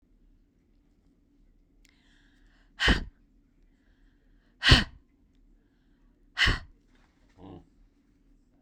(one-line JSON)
{"exhalation_length": "8.6 s", "exhalation_amplitude": 21811, "exhalation_signal_mean_std_ratio": 0.22, "survey_phase": "beta (2021-08-13 to 2022-03-07)", "age": "65+", "gender": "Female", "wearing_mask": "No", "symptom_none": true, "smoker_status": "Never smoked", "respiratory_condition_asthma": false, "respiratory_condition_other": false, "recruitment_source": "REACT", "submission_delay": "2 days", "covid_test_result": "Negative", "covid_test_method": "RT-qPCR", "influenza_a_test_result": "Negative", "influenza_b_test_result": "Negative"}